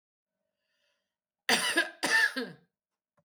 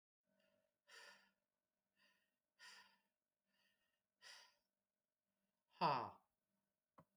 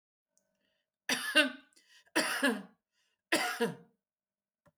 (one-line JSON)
{"cough_length": "3.2 s", "cough_amplitude": 8274, "cough_signal_mean_std_ratio": 0.39, "exhalation_length": "7.2 s", "exhalation_amplitude": 1358, "exhalation_signal_mean_std_ratio": 0.19, "three_cough_length": "4.8 s", "three_cough_amplitude": 9547, "three_cough_signal_mean_std_ratio": 0.38, "survey_phase": "beta (2021-08-13 to 2022-03-07)", "age": "45-64", "gender": "Female", "wearing_mask": "No", "symptom_none": true, "smoker_status": "Current smoker (11 or more cigarettes per day)", "respiratory_condition_asthma": false, "respiratory_condition_other": false, "recruitment_source": "REACT", "submission_delay": "18 days", "covid_test_result": "Negative", "covid_test_method": "RT-qPCR"}